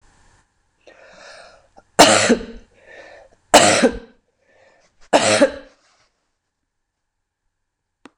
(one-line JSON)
{"three_cough_length": "8.2 s", "three_cough_amplitude": 26028, "three_cough_signal_mean_std_ratio": 0.3, "survey_phase": "beta (2021-08-13 to 2022-03-07)", "age": "65+", "gender": "Female", "wearing_mask": "No", "symptom_cough_any": true, "symptom_fatigue": true, "symptom_other": true, "symptom_onset": "4 days", "smoker_status": "Ex-smoker", "respiratory_condition_asthma": false, "respiratory_condition_other": false, "recruitment_source": "Test and Trace", "submission_delay": "1 day", "covid_test_result": "Positive", "covid_test_method": "ePCR"}